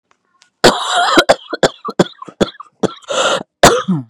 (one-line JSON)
{"cough_length": "4.1 s", "cough_amplitude": 32768, "cough_signal_mean_std_ratio": 0.48, "survey_phase": "beta (2021-08-13 to 2022-03-07)", "age": "18-44", "gender": "Female", "wearing_mask": "No", "symptom_none": true, "smoker_status": "Ex-smoker", "respiratory_condition_asthma": false, "respiratory_condition_other": false, "recruitment_source": "REACT", "submission_delay": "4 days", "covid_test_result": "Negative", "covid_test_method": "RT-qPCR", "influenza_a_test_result": "Negative", "influenza_b_test_result": "Negative"}